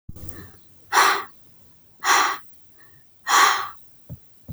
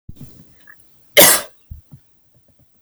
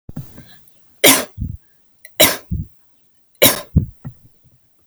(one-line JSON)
{"exhalation_length": "4.5 s", "exhalation_amplitude": 24874, "exhalation_signal_mean_std_ratio": 0.45, "cough_length": "2.8 s", "cough_amplitude": 32768, "cough_signal_mean_std_ratio": 0.27, "three_cough_length": "4.9 s", "three_cough_amplitude": 32768, "three_cough_signal_mean_std_ratio": 0.33, "survey_phase": "alpha (2021-03-01 to 2021-08-12)", "age": "18-44", "gender": "Female", "wearing_mask": "No", "symptom_none": true, "smoker_status": "Never smoked", "respiratory_condition_asthma": false, "respiratory_condition_other": false, "recruitment_source": "REACT", "submission_delay": "1 day", "covid_test_result": "Negative", "covid_test_method": "RT-qPCR"}